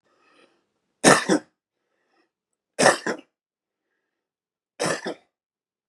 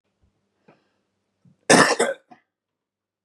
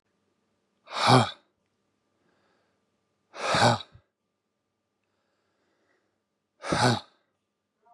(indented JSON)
{
  "three_cough_length": "5.9 s",
  "three_cough_amplitude": 31484,
  "three_cough_signal_mean_std_ratio": 0.25,
  "cough_length": "3.2 s",
  "cough_amplitude": 32674,
  "cough_signal_mean_std_ratio": 0.25,
  "exhalation_length": "7.9 s",
  "exhalation_amplitude": 19933,
  "exhalation_signal_mean_std_ratio": 0.27,
  "survey_phase": "beta (2021-08-13 to 2022-03-07)",
  "age": "45-64",
  "gender": "Male",
  "wearing_mask": "No",
  "symptom_cough_any": true,
  "symptom_runny_or_blocked_nose": true,
  "symptom_fatigue": true,
  "symptom_headache": true,
  "symptom_onset": "5 days",
  "smoker_status": "Current smoker (e-cigarettes or vapes only)",
  "respiratory_condition_asthma": true,
  "respiratory_condition_other": false,
  "recruitment_source": "Test and Trace",
  "submission_delay": "1 day",
  "covid_test_result": "Positive",
  "covid_test_method": "RT-qPCR",
  "covid_ct_value": 17.6,
  "covid_ct_gene": "ORF1ab gene"
}